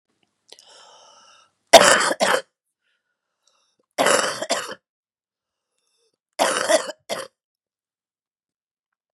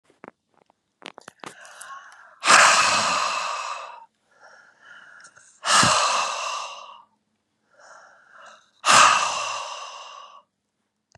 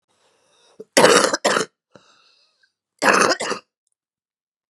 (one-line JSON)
{"three_cough_length": "9.1 s", "three_cough_amplitude": 32768, "three_cough_signal_mean_std_ratio": 0.29, "exhalation_length": "11.2 s", "exhalation_amplitude": 29264, "exhalation_signal_mean_std_ratio": 0.41, "cough_length": "4.7 s", "cough_amplitude": 32767, "cough_signal_mean_std_ratio": 0.36, "survey_phase": "beta (2021-08-13 to 2022-03-07)", "age": "45-64", "gender": "Female", "wearing_mask": "No", "symptom_shortness_of_breath": true, "symptom_diarrhoea": true, "symptom_headache": true, "smoker_status": "Current smoker (11 or more cigarettes per day)", "respiratory_condition_asthma": false, "respiratory_condition_other": false, "recruitment_source": "Test and Trace", "submission_delay": "1 day", "covid_test_result": "Positive", "covid_test_method": "RT-qPCR", "covid_ct_value": 19.1, "covid_ct_gene": "N gene", "covid_ct_mean": 19.8, "covid_viral_load": "320000 copies/ml", "covid_viral_load_category": "Low viral load (10K-1M copies/ml)"}